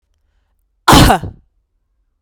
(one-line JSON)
{"cough_length": "2.2 s", "cough_amplitude": 32768, "cough_signal_mean_std_ratio": 0.33, "survey_phase": "beta (2021-08-13 to 2022-03-07)", "age": "18-44", "gender": "Female", "wearing_mask": "Yes", "symptom_sore_throat": true, "smoker_status": "Ex-smoker", "respiratory_condition_asthma": false, "respiratory_condition_other": false, "recruitment_source": "REACT", "submission_delay": "-15 days", "covid_test_result": "Negative", "covid_test_method": "RT-qPCR", "influenza_a_test_result": "Unknown/Void", "influenza_b_test_result": "Unknown/Void"}